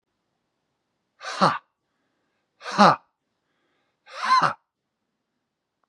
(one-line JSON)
{"exhalation_length": "5.9 s", "exhalation_amplitude": 30529, "exhalation_signal_mean_std_ratio": 0.26, "survey_phase": "beta (2021-08-13 to 2022-03-07)", "age": "45-64", "gender": "Male", "wearing_mask": "No", "symptom_none": true, "smoker_status": "Never smoked", "respiratory_condition_asthma": false, "respiratory_condition_other": false, "recruitment_source": "REACT", "submission_delay": "1 day", "covid_test_result": "Negative", "covid_test_method": "RT-qPCR", "influenza_a_test_result": "Negative", "influenza_b_test_result": "Negative"}